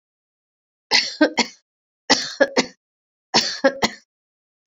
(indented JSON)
{
  "three_cough_length": "4.7 s",
  "three_cough_amplitude": 29088,
  "three_cough_signal_mean_std_ratio": 0.35,
  "survey_phase": "beta (2021-08-13 to 2022-03-07)",
  "age": "65+",
  "gender": "Female",
  "wearing_mask": "No",
  "symptom_none": true,
  "smoker_status": "Ex-smoker",
  "respiratory_condition_asthma": false,
  "respiratory_condition_other": false,
  "recruitment_source": "REACT",
  "submission_delay": "1 day",
  "covid_test_result": "Negative",
  "covid_test_method": "RT-qPCR"
}